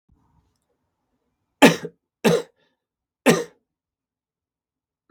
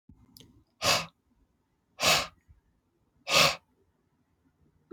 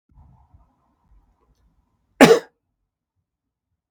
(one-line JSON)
{"three_cough_length": "5.1 s", "three_cough_amplitude": 32767, "three_cough_signal_mean_std_ratio": 0.22, "exhalation_length": "4.9 s", "exhalation_amplitude": 12581, "exhalation_signal_mean_std_ratio": 0.3, "cough_length": "3.9 s", "cough_amplitude": 32768, "cough_signal_mean_std_ratio": 0.17, "survey_phase": "beta (2021-08-13 to 2022-03-07)", "age": "45-64", "gender": "Male", "wearing_mask": "No", "symptom_cough_any": true, "symptom_runny_or_blocked_nose": true, "symptom_change_to_sense_of_smell_or_taste": true, "symptom_loss_of_taste": true, "symptom_onset": "3 days", "smoker_status": "Never smoked", "respiratory_condition_asthma": false, "respiratory_condition_other": false, "recruitment_source": "Test and Trace", "submission_delay": "2 days", "covid_test_result": "Positive", "covid_test_method": "RT-qPCR", "covid_ct_value": 23.6, "covid_ct_gene": "N gene"}